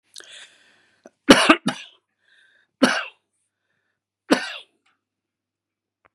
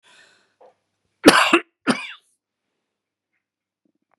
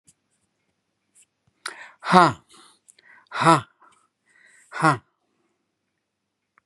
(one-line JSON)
{"three_cough_length": "6.1 s", "three_cough_amplitude": 32768, "three_cough_signal_mean_std_ratio": 0.23, "cough_length": "4.2 s", "cough_amplitude": 32768, "cough_signal_mean_std_ratio": 0.23, "exhalation_length": "6.7 s", "exhalation_amplitude": 32767, "exhalation_signal_mean_std_ratio": 0.23, "survey_phase": "beta (2021-08-13 to 2022-03-07)", "age": "65+", "gender": "Male", "wearing_mask": "No", "symptom_none": true, "smoker_status": "Never smoked", "respiratory_condition_asthma": false, "respiratory_condition_other": false, "recruitment_source": "REACT", "submission_delay": "1 day", "covid_test_result": "Negative", "covid_test_method": "RT-qPCR", "influenza_a_test_result": "Negative", "influenza_b_test_result": "Negative"}